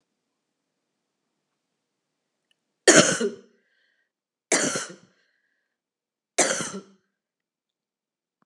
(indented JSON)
{
  "three_cough_length": "8.5 s",
  "three_cough_amplitude": 30029,
  "three_cough_signal_mean_std_ratio": 0.23,
  "survey_phase": "beta (2021-08-13 to 2022-03-07)",
  "age": "45-64",
  "gender": "Female",
  "wearing_mask": "No",
  "symptom_cough_any": true,
  "symptom_runny_or_blocked_nose": true,
  "symptom_fatigue": true,
  "symptom_headache": true,
  "symptom_change_to_sense_of_smell_or_taste": true,
  "symptom_onset": "3 days",
  "smoker_status": "Never smoked",
  "respiratory_condition_asthma": false,
  "respiratory_condition_other": false,
  "recruitment_source": "Test and Trace",
  "submission_delay": "1 day",
  "covid_test_result": "Positive",
  "covid_test_method": "RT-qPCR"
}